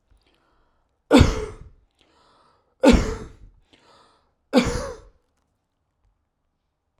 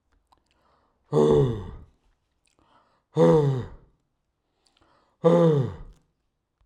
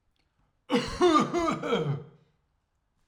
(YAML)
three_cough_length: 7.0 s
three_cough_amplitude: 32767
three_cough_signal_mean_std_ratio: 0.27
exhalation_length: 6.7 s
exhalation_amplitude: 16044
exhalation_signal_mean_std_ratio: 0.39
cough_length: 3.1 s
cough_amplitude: 9893
cough_signal_mean_std_ratio: 0.51
survey_phase: alpha (2021-03-01 to 2021-08-12)
age: 45-64
gender: Male
wearing_mask: 'No'
symptom_shortness_of_breath: true
symptom_fatigue: true
symptom_onset: 13 days
smoker_status: Ex-smoker
respiratory_condition_asthma: false
respiratory_condition_other: false
recruitment_source: REACT
submission_delay: 2 days
covid_test_result: Negative
covid_test_method: RT-qPCR